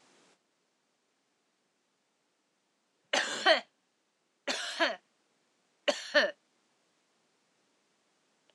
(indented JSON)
{
  "three_cough_length": "8.5 s",
  "three_cough_amplitude": 11845,
  "three_cough_signal_mean_std_ratio": 0.25,
  "survey_phase": "alpha (2021-03-01 to 2021-08-12)",
  "age": "45-64",
  "gender": "Female",
  "wearing_mask": "No",
  "symptom_none": true,
  "smoker_status": "Never smoked",
  "respiratory_condition_asthma": false,
  "respiratory_condition_other": false,
  "recruitment_source": "REACT",
  "submission_delay": "3 days",
  "covid_test_result": "Negative",
  "covid_test_method": "RT-qPCR"
}